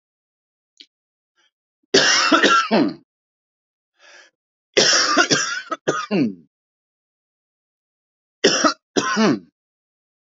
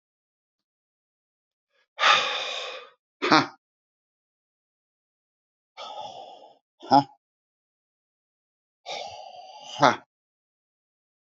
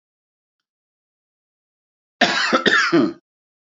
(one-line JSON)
{"three_cough_length": "10.3 s", "three_cough_amplitude": 27869, "three_cough_signal_mean_std_ratio": 0.42, "exhalation_length": "11.3 s", "exhalation_amplitude": 28634, "exhalation_signal_mean_std_ratio": 0.24, "cough_length": "3.8 s", "cough_amplitude": 32767, "cough_signal_mean_std_ratio": 0.38, "survey_phase": "beta (2021-08-13 to 2022-03-07)", "age": "45-64", "gender": "Male", "wearing_mask": "No", "symptom_cough_any": true, "smoker_status": "Never smoked", "respiratory_condition_asthma": false, "respiratory_condition_other": false, "recruitment_source": "REACT", "submission_delay": "1 day", "covid_test_result": "Negative", "covid_test_method": "RT-qPCR", "influenza_a_test_result": "Negative", "influenza_b_test_result": "Negative"}